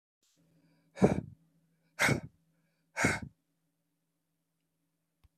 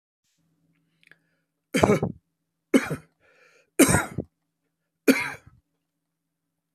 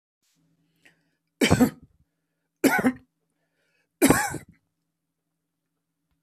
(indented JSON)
{
  "exhalation_length": "5.4 s",
  "exhalation_amplitude": 10399,
  "exhalation_signal_mean_std_ratio": 0.25,
  "cough_length": "6.7 s",
  "cough_amplitude": 31497,
  "cough_signal_mean_std_ratio": 0.27,
  "three_cough_length": "6.2 s",
  "three_cough_amplitude": 24798,
  "three_cough_signal_mean_std_ratio": 0.28,
  "survey_phase": "alpha (2021-03-01 to 2021-08-12)",
  "age": "65+",
  "gender": "Male",
  "wearing_mask": "No",
  "symptom_none": true,
  "smoker_status": "Current smoker (11 or more cigarettes per day)",
  "respiratory_condition_asthma": false,
  "respiratory_condition_other": false,
  "recruitment_source": "REACT",
  "submission_delay": "4 days",
  "covid_test_result": "Negative",
  "covid_test_method": "RT-qPCR"
}